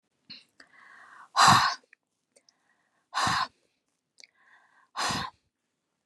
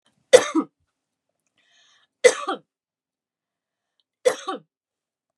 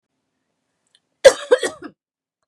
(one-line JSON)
{"exhalation_length": "6.1 s", "exhalation_amplitude": 19718, "exhalation_signal_mean_std_ratio": 0.3, "three_cough_length": "5.4 s", "three_cough_amplitude": 32768, "three_cough_signal_mean_std_ratio": 0.2, "cough_length": "2.5 s", "cough_amplitude": 32768, "cough_signal_mean_std_ratio": 0.21, "survey_phase": "beta (2021-08-13 to 2022-03-07)", "age": "18-44", "gender": "Female", "wearing_mask": "No", "symptom_none": true, "smoker_status": "Never smoked", "respiratory_condition_asthma": false, "respiratory_condition_other": false, "recruitment_source": "REACT", "submission_delay": "2 days", "covid_test_result": "Negative", "covid_test_method": "RT-qPCR"}